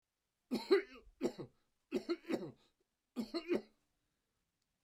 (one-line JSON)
{"three_cough_length": "4.8 s", "three_cough_amplitude": 4074, "three_cough_signal_mean_std_ratio": 0.35, "survey_phase": "beta (2021-08-13 to 2022-03-07)", "age": "65+", "gender": "Male", "wearing_mask": "No", "symptom_none": true, "smoker_status": "Never smoked", "respiratory_condition_asthma": false, "respiratory_condition_other": false, "recruitment_source": "REACT", "submission_delay": "1 day", "covid_test_result": "Negative", "covid_test_method": "RT-qPCR"}